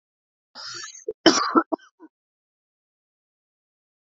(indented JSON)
{
  "cough_length": "4.0 s",
  "cough_amplitude": 27395,
  "cough_signal_mean_std_ratio": 0.24,
  "survey_phase": "alpha (2021-03-01 to 2021-08-12)",
  "age": "18-44",
  "gender": "Male",
  "wearing_mask": "No",
  "symptom_cough_any": true,
  "symptom_fatigue": true,
  "symptom_headache": true,
  "symptom_onset": "3 days",
  "smoker_status": "Ex-smoker",
  "respiratory_condition_asthma": false,
  "respiratory_condition_other": false,
  "recruitment_source": "Test and Trace",
  "submission_delay": "1 day",
  "covid_test_result": "Positive",
  "covid_test_method": "RT-qPCR"
}